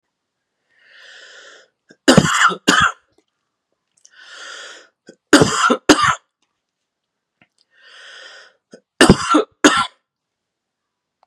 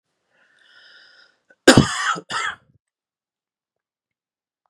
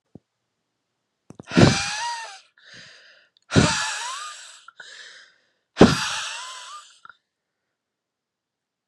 {
  "three_cough_length": "11.3 s",
  "three_cough_amplitude": 32768,
  "three_cough_signal_mean_std_ratio": 0.32,
  "cough_length": "4.7 s",
  "cough_amplitude": 32768,
  "cough_signal_mean_std_ratio": 0.23,
  "exhalation_length": "8.9 s",
  "exhalation_amplitude": 32768,
  "exhalation_signal_mean_std_ratio": 0.3,
  "survey_phase": "beta (2021-08-13 to 2022-03-07)",
  "age": "18-44",
  "gender": "Male",
  "wearing_mask": "No",
  "symptom_runny_or_blocked_nose": true,
  "symptom_sore_throat": true,
  "symptom_fatigue": true,
  "symptom_headache": true,
  "symptom_change_to_sense_of_smell_or_taste": true,
  "symptom_onset": "4 days",
  "smoker_status": "Never smoked",
  "respiratory_condition_asthma": false,
  "respiratory_condition_other": false,
  "recruitment_source": "Test and Trace",
  "submission_delay": "3 days",
  "covid_test_result": "Positive",
  "covid_test_method": "ePCR"
}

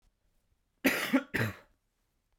{
  "cough_length": "2.4 s",
  "cough_amplitude": 8752,
  "cough_signal_mean_std_ratio": 0.36,
  "survey_phase": "beta (2021-08-13 to 2022-03-07)",
  "age": "18-44",
  "gender": "Male",
  "wearing_mask": "No",
  "symptom_cough_any": true,
  "symptom_diarrhoea": true,
  "symptom_fatigue": true,
  "symptom_headache": true,
  "symptom_onset": "3 days",
  "smoker_status": "Never smoked",
  "respiratory_condition_asthma": true,
  "respiratory_condition_other": false,
  "recruitment_source": "Test and Trace",
  "submission_delay": "2 days",
  "covid_test_result": "Positive",
  "covid_test_method": "RT-qPCR",
  "covid_ct_value": 19.2,
  "covid_ct_gene": "ORF1ab gene"
}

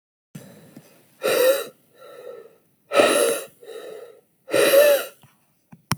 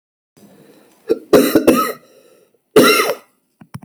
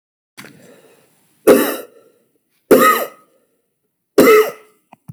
{
  "exhalation_length": "6.0 s",
  "exhalation_amplitude": 32767,
  "exhalation_signal_mean_std_ratio": 0.44,
  "cough_length": "3.8 s",
  "cough_amplitude": 32767,
  "cough_signal_mean_std_ratio": 0.41,
  "three_cough_length": "5.1 s",
  "three_cough_amplitude": 31115,
  "three_cough_signal_mean_std_ratio": 0.35,
  "survey_phase": "beta (2021-08-13 to 2022-03-07)",
  "age": "18-44",
  "gender": "Male",
  "wearing_mask": "No",
  "symptom_cough_any": true,
  "symptom_runny_or_blocked_nose": true,
  "symptom_sore_throat": true,
  "symptom_fatigue": true,
  "symptom_fever_high_temperature": true,
  "symptom_headache": true,
  "smoker_status": "Ex-smoker",
  "respiratory_condition_asthma": false,
  "respiratory_condition_other": false,
  "recruitment_source": "Test and Trace",
  "submission_delay": "1 day",
  "covid_test_result": "Positive",
  "covid_test_method": "RT-qPCR",
  "covid_ct_value": 30.8,
  "covid_ct_gene": "N gene"
}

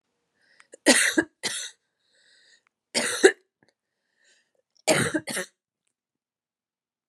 {
  "three_cough_length": "7.1 s",
  "three_cough_amplitude": 26831,
  "three_cough_signal_mean_std_ratio": 0.29,
  "survey_phase": "beta (2021-08-13 to 2022-03-07)",
  "age": "18-44",
  "gender": "Female",
  "wearing_mask": "No",
  "symptom_runny_or_blocked_nose": true,
  "symptom_fatigue": true,
  "symptom_headache": true,
  "symptom_change_to_sense_of_smell_or_taste": true,
  "symptom_loss_of_taste": true,
  "symptom_onset": "6 days",
  "smoker_status": "Ex-smoker",
  "respiratory_condition_asthma": false,
  "respiratory_condition_other": false,
  "recruitment_source": "Test and Trace",
  "submission_delay": "2 days",
  "covid_test_result": "Positive",
  "covid_test_method": "RT-qPCR",
  "covid_ct_value": 19.8,
  "covid_ct_gene": "ORF1ab gene"
}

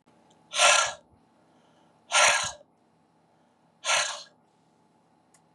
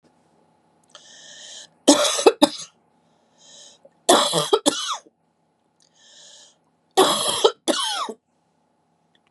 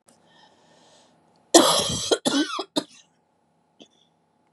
{
  "exhalation_length": "5.5 s",
  "exhalation_amplitude": 15427,
  "exhalation_signal_mean_std_ratio": 0.34,
  "three_cough_length": "9.3 s",
  "three_cough_amplitude": 32768,
  "three_cough_signal_mean_std_ratio": 0.35,
  "cough_length": "4.5 s",
  "cough_amplitude": 32353,
  "cough_signal_mean_std_ratio": 0.32,
  "survey_phase": "beta (2021-08-13 to 2022-03-07)",
  "age": "45-64",
  "gender": "Female",
  "wearing_mask": "No",
  "symptom_cough_any": true,
  "symptom_runny_or_blocked_nose": true,
  "symptom_onset": "3 days",
  "smoker_status": "Ex-smoker",
  "respiratory_condition_asthma": false,
  "respiratory_condition_other": false,
  "recruitment_source": "Test and Trace",
  "submission_delay": "2 days",
  "covid_test_result": "Positive",
  "covid_test_method": "RT-qPCR",
  "covid_ct_value": 26.8,
  "covid_ct_gene": "ORF1ab gene",
  "covid_ct_mean": 27.2,
  "covid_viral_load": "1200 copies/ml",
  "covid_viral_load_category": "Minimal viral load (< 10K copies/ml)"
}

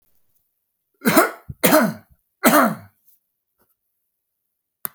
{
  "cough_length": "4.9 s",
  "cough_amplitude": 32768,
  "cough_signal_mean_std_ratio": 0.33,
  "survey_phase": "alpha (2021-03-01 to 2021-08-12)",
  "age": "45-64",
  "gender": "Male",
  "wearing_mask": "No",
  "symptom_none": true,
  "smoker_status": "Ex-smoker",
  "respiratory_condition_asthma": false,
  "respiratory_condition_other": false,
  "recruitment_source": "REACT",
  "submission_delay": "5 days",
  "covid_test_result": "Negative",
  "covid_test_method": "RT-qPCR"
}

